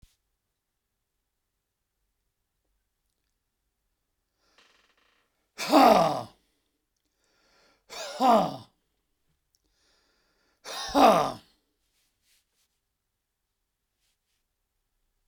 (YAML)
exhalation_length: 15.3 s
exhalation_amplitude: 17973
exhalation_signal_mean_std_ratio: 0.23
survey_phase: beta (2021-08-13 to 2022-03-07)
age: 65+
gender: Male
wearing_mask: 'No'
symptom_none: true
smoker_status: Ex-smoker
respiratory_condition_asthma: false
respiratory_condition_other: false
recruitment_source: REACT
submission_delay: 2 days
covid_test_result: Negative
covid_test_method: RT-qPCR